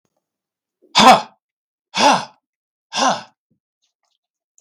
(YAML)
exhalation_length: 4.6 s
exhalation_amplitude: 32768
exhalation_signal_mean_std_ratio: 0.3
survey_phase: beta (2021-08-13 to 2022-03-07)
age: 65+
gender: Male
wearing_mask: 'No'
symptom_none: true
smoker_status: Never smoked
respiratory_condition_asthma: false
respiratory_condition_other: false
recruitment_source: REACT
submission_delay: 3 days
covid_test_result: Negative
covid_test_method: RT-qPCR
influenza_a_test_result: Unknown/Void
influenza_b_test_result: Unknown/Void